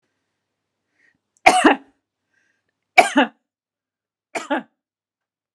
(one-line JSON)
{"three_cough_length": "5.5 s", "three_cough_amplitude": 32768, "three_cough_signal_mean_std_ratio": 0.24, "survey_phase": "beta (2021-08-13 to 2022-03-07)", "age": "45-64", "gender": "Female", "wearing_mask": "No", "symptom_none": true, "smoker_status": "Never smoked", "respiratory_condition_asthma": false, "respiratory_condition_other": false, "recruitment_source": "REACT", "submission_delay": "1 day", "covid_test_result": "Negative", "covid_test_method": "RT-qPCR"}